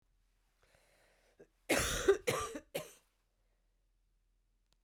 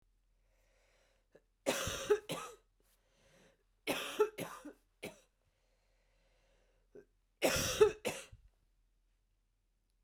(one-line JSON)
{"cough_length": "4.8 s", "cough_amplitude": 4949, "cough_signal_mean_std_ratio": 0.3, "three_cough_length": "10.0 s", "three_cough_amplitude": 6748, "three_cough_signal_mean_std_ratio": 0.3, "survey_phase": "beta (2021-08-13 to 2022-03-07)", "age": "45-64", "gender": "Female", "wearing_mask": "No", "symptom_cough_any": true, "symptom_runny_or_blocked_nose": true, "symptom_headache": true, "symptom_other": true, "symptom_onset": "2 days", "smoker_status": "Never smoked", "respiratory_condition_asthma": false, "respiratory_condition_other": false, "recruitment_source": "Test and Trace", "submission_delay": "1 day", "covid_test_result": "Positive", "covid_test_method": "RT-qPCR"}